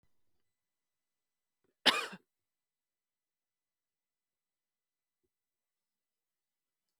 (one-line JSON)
{"cough_length": "7.0 s", "cough_amplitude": 9135, "cough_signal_mean_std_ratio": 0.12, "survey_phase": "alpha (2021-03-01 to 2021-08-12)", "age": "45-64", "gender": "Female", "wearing_mask": "No", "symptom_none": true, "smoker_status": "Ex-smoker", "respiratory_condition_asthma": false, "respiratory_condition_other": false, "recruitment_source": "REACT", "submission_delay": "1 day", "covid_test_result": "Negative", "covid_test_method": "RT-qPCR"}